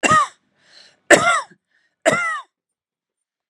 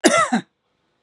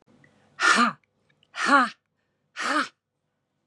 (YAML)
three_cough_length: 3.5 s
three_cough_amplitude: 32768
three_cough_signal_mean_std_ratio: 0.38
cough_length: 1.0 s
cough_amplitude: 32767
cough_signal_mean_std_ratio: 0.46
exhalation_length: 3.7 s
exhalation_amplitude: 15570
exhalation_signal_mean_std_ratio: 0.38
survey_phase: beta (2021-08-13 to 2022-03-07)
age: 45-64
gender: Female
wearing_mask: 'No'
symptom_none: true
smoker_status: Never smoked
respiratory_condition_asthma: false
respiratory_condition_other: false
recruitment_source: REACT
submission_delay: 2 days
covid_test_result: Negative
covid_test_method: RT-qPCR
influenza_a_test_result: Negative
influenza_b_test_result: Negative